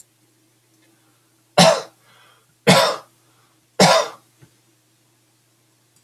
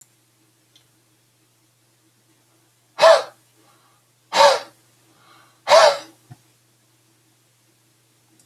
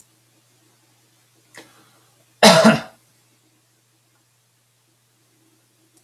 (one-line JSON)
{"three_cough_length": "6.0 s", "three_cough_amplitude": 32768, "three_cough_signal_mean_std_ratio": 0.29, "exhalation_length": "8.5 s", "exhalation_amplitude": 31908, "exhalation_signal_mean_std_ratio": 0.24, "cough_length": "6.0 s", "cough_amplitude": 32768, "cough_signal_mean_std_ratio": 0.2, "survey_phase": "beta (2021-08-13 to 2022-03-07)", "age": "45-64", "gender": "Male", "wearing_mask": "No", "symptom_none": true, "smoker_status": "Ex-smoker", "respiratory_condition_asthma": false, "respiratory_condition_other": false, "recruitment_source": "REACT", "submission_delay": "2 days", "covid_test_result": "Negative", "covid_test_method": "RT-qPCR"}